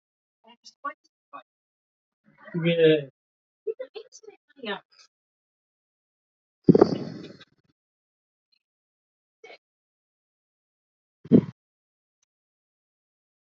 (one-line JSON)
{"exhalation_length": "13.6 s", "exhalation_amplitude": 29018, "exhalation_signal_mean_std_ratio": 0.2, "survey_phase": "alpha (2021-03-01 to 2021-08-12)", "age": "45-64", "gender": "Male", "wearing_mask": "No", "symptom_none": true, "smoker_status": "Ex-smoker", "recruitment_source": "REACT", "submission_delay": "1 day", "covid_test_result": "Negative", "covid_test_method": "RT-qPCR"}